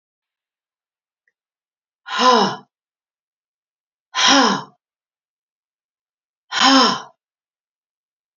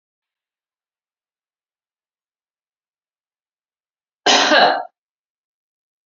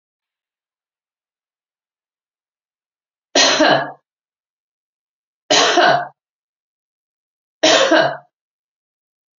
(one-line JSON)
{"exhalation_length": "8.4 s", "exhalation_amplitude": 29336, "exhalation_signal_mean_std_ratio": 0.31, "cough_length": "6.1 s", "cough_amplitude": 30040, "cough_signal_mean_std_ratio": 0.24, "three_cough_length": "9.4 s", "three_cough_amplitude": 31688, "three_cough_signal_mean_std_ratio": 0.33, "survey_phase": "beta (2021-08-13 to 2022-03-07)", "age": "45-64", "gender": "Female", "wearing_mask": "No", "symptom_none": true, "smoker_status": "Prefer not to say", "respiratory_condition_asthma": false, "respiratory_condition_other": false, "recruitment_source": "REACT", "submission_delay": "1 day", "covid_test_result": "Negative", "covid_test_method": "RT-qPCR"}